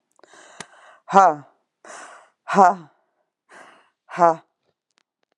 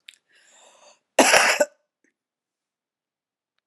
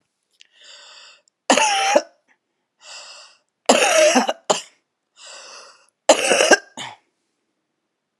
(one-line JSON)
{"exhalation_length": "5.4 s", "exhalation_amplitude": 32603, "exhalation_signal_mean_std_ratio": 0.26, "cough_length": "3.7 s", "cough_amplitude": 32767, "cough_signal_mean_std_ratio": 0.27, "three_cough_length": "8.2 s", "three_cough_amplitude": 32768, "three_cough_signal_mean_std_ratio": 0.37, "survey_phase": "alpha (2021-03-01 to 2021-08-12)", "age": "45-64", "gender": "Female", "wearing_mask": "No", "symptom_none": true, "symptom_onset": "5 days", "smoker_status": "Current smoker (11 or more cigarettes per day)", "respiratory_condition_asthma": false, "respiratory_condition_other": false, "recruitment_source": "REACT", "submission_delay": "9 days", "covid_test_result": "Negative", "covid_test_method": "RT-qPCR"}